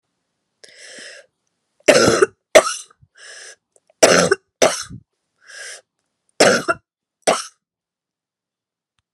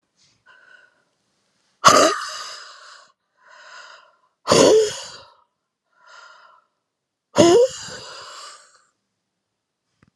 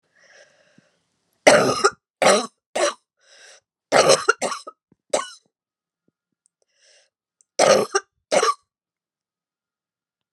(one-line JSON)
{"three_cough_length": "9.1 s", "three_cough_amplitude": 32768, "three_cough_signal_mean_std_ratio": 0.3, "exhalation_length": "10.2 s", "exhalation_amplitude": 32768, "exhalation_signal_mean_std_ratio": 0.3, "cough_length": "10.3 s", "cough_amplitude": 32768, "cough_signal_mean_std_ratio": 0.32, "survey_phase": "beta (2021-08-13 to 2022-03-07)", "age": "45-64", "gender": "Female", "wearing_mask": "No", "symptom_cough_any": true, "symptom_runny_or_blocked_nose": true, "symptom_diarrhoea": true, "symptom_headache": true, "symptom_change_to_sense_of_smell_or_taste": true, "symptom_loss_of_taste": true, "symptom_onset": "5 days", "smoker_status": "Ex-smoker", "respiratory_condition_asthma": false, "respiratory_condition_other": true, "recruitment_source": "Test and Trace", "submission_delay": "2 days", "covid_test_result": "Positive", "covid_test_method": "RT-qPCR"}